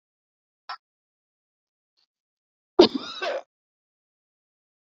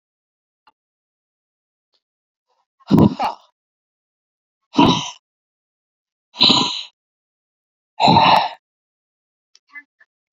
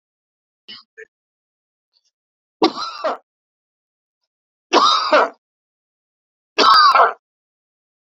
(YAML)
cough_length: 4.9 s
cough_amplitude: 26761
cough_signal_mean_std_ratio: 0.16
exhalation_length: 10.3 s
exhalation_amplitude: 32768
exhalation_signal_mean_std_ratio: 0.29
three_cough_length: 8.1 s
three_cough_amplitude: 31195
three_cough_signal_mean_std_ratio: 0.33
survey_phase: beta (2021-08-13 to 2022-03-07)
age: 45-64
gender: Male
wearing_mask: 'No'
symptom_fatigue: true
symptom_headache: true
symptom_onset: 12 days
smoker_status: Never smoked
respiratory_condition_asthma: false
respiratory_condition_other: false
recruitment_source: REACT
submission_delay: 3 days
covid_test_result: Negative
covid_test_method: RT-qPCR